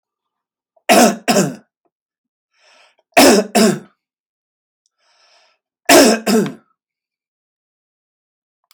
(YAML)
three_cough_length: 8.7 s
three_cough_amplitude: 32768
three_cough_signal_mean_std_ratio: 0.34
survey_phase: beta (2021-08-13 to 2022-03-07)
age: 45-64
gender: Male
wearing_mask: 'No'
symptom_none: true
smoker_status: Ex-smoker
respiratory_condition_asthma: false
respiratory_condition_other: false
recruitment_source: REACT
submission_delay: 1 day
covid_test_result: Negative
covid_test_method: RT-qPCR